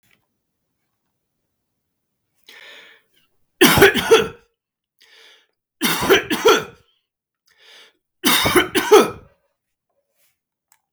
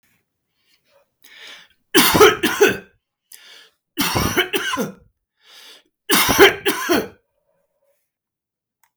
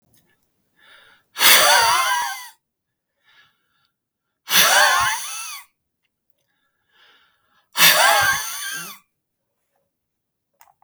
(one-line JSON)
{"cough_length": "10.9 s", "cough_amplitude": 32768, "cough_signal_mean_std_ratio": 0.32, "three_cough_length": "9.0 s", "three_cough_amplitude": 32768, "three_cough_signal_mean_std_ratio": 0.38, "exhalation_length": "10.8 s", "exhalation_amplitude": 32768, "exhalation_signal_mean_std_ratio": 0.4, "survey_phase": "beta (2021-08-13 to 2022-03-07)", "age": "45-64", "gender": "Male", "wearing_mask": "No", "symptom_none": true, "smoker_status": "Never smoked", "respiratory_condition_asthma": false, "respiratory_condition_other": false, "recruitment_source": "REACT", "submission_delay": "1 day", "covid_test_result": "Negative", "covid_test_method": "RT-qPCR"}